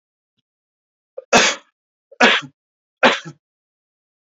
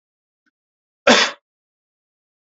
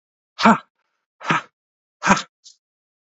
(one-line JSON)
{"three_cough_length": "4.4 s", "three_cough_amplitude": 32291, "three_cough_signal_mean_std_ratio": 0.28, "cough_length": "2.5 s", "cough_amplitude": 30443, "cough_signal_mean_std_ratio": 0.23, "exhalation_length": "3.2 s", "exhalation_amplitude": 27518, "exhalation_signal_mean_std_ratio": 0.28, "survey_phase": "beta (2021-08-13 to 2022-03-07)", "age": "45-64", "gender": "Male", "wearing_mask": "No", "symptom_none": true, "smoker_status": "Never smoked", "respiratory_condition_asthma": false, "respiratory_condition_other": false, "recruitment_source": "REACT", "submission_delay": "2 days", "covid_test_result": "Negative", "covid_test_method": "RT-qPCR", "influenza_a_test_result": "Negative", "influenza_b_test_result": "Negative"}